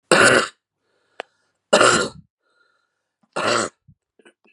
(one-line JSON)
{"three_cough_length": "4.5 s", "three_cough_amplitude": 32768, "three_cough_signal_mean_std_ratio": 0.36, "survey_phase": "beta (2021-08-13 to 2022-03-07)", "age": "45-64", "gender": "Female", "wearing_mask": "No", "symptom_none": true, "symptom_onset": "12 days", "smoker_status": "Ex-smoker", "respiratory_condition_asthma": false, "respiratory_condition_other": false, "recruitment_source": "REACT", "submission_delay": "3 days", "covid_test_result": "Positive", "covid_test_method": "RT-qPCR", "covid_ct_value": 24.8, "covid_ct_gene": "E gene", "influenza_a_test_result": "Negative", "influenza_b_test_result": "Negative"}